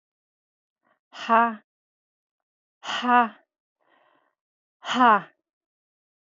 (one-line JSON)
{"exhalation_length": "6.3 s", "exhalation_amplitude": 17833, "exhalation_signal_mean_std_ratio": 0.27, "survey_phase": "beta (2021-08-13 to 2022-03-07)", "age": "45-64", "gender": "Female", "wearing_mask": "No", "symptom_none": true, "smoker_status": "Ex-smoker", "respiratory_condition_asthma": false, "respiratory_condition_other": false, "recruitment_source": "REACT", "submission_delay": "1 day", "covid_test_result": "Negative", "covid_test_method": "RT-qPCR", "influenza_a_test_result": "Negative", "influenza_b_test_result": "Negative"}